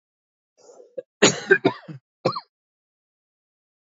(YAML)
cough_length: 3.9 s
cough_amplitude: 26351
cough_signal_mean_std_ratio: 0.24
survey_phase: beta (2021-08-13 to 2022-03-07)
age: 45-64
gender: Male
wearing_mask: 'No'
symptom_cough_any: true
symptom_runny_or_blocked_nose: true
symptom_sore_throat: true
symptom_fatigue: true
symptom_headache: true
symptom_change_to_sense_of_smell_or_taste: true
symptom_onset: 2 days
smoker_status: Never smoked
respiratory_condition_asthma: false
respiratory_condition_other: false
recruitment_source: Test and Trace
submission_delay: 1 day
covid_test_result: Positive
covid_test_method: RT-qPCR
covid_ct_value: 19.8
covid_ct_gene: ORF1ab gene
covid_ct_mean: 20.2
covid_viral_load: 240000 copies/ml
covid_viral_load_category: Low viral load (10K-1M copies/ml)